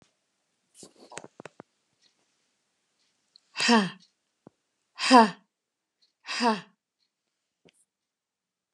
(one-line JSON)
{"exhalation_length": "8.7 s", "exhalation_amplitude": 23888, "exhalation_signal_mean_std_ratio": 0.22, "survey_phase": "alpha (2021-03-01 to 2021-08-12)", "age": "65+", "gender": "Female", "wearing_mask": "No", "symptom_none": true, "smoker_status": "Ex-smoker", "respiratory_condition_asthma": false, "respiratory_condition_other": false, "recruitment_source": "REACT", "submission_delay": "3 days", "covid_test_result": "Negative", "covid_test_method": "RT-qPCR"}